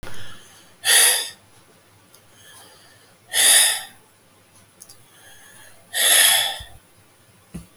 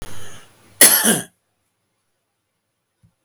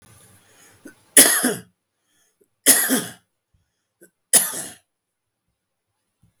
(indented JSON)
{
  "exhalation_length": "7.8 s",
  "exhalation_amplitude": 30203,
  "exhalation_signal_mean_std_ratio": 0.41,
  "cough_length": "3.2 s",
  "cough_amplitude": 32768,
  "cough_signal_mean_std_ratio": 0.32,
  "three_cough_length": "6.4 s",
  "three_cough_amplitude": 32768,
  "three_cough_signal_mean_std_ratio": 0.28,
  "survey_phase": "beta (2021-08-13 to 2022-03-07)",
  "age": "45-64",
  "gender": "Male",
  "wearing_mask": "No",
  "symptom_none": true,
  "smoker_status": "Ex-smoker",
  "respiratory_condition_asthma": false,
  "respiratory_condition_other": false,
  "recruitment_source": "REACT",
  "submission_delay": "3 days",
  "covid_test_result": "Negative",
  "covid_test_method": "RT-qPCR",
  "influenza_a_test_result": "Negative",
  "influenza_b_test_result": "Negative"
}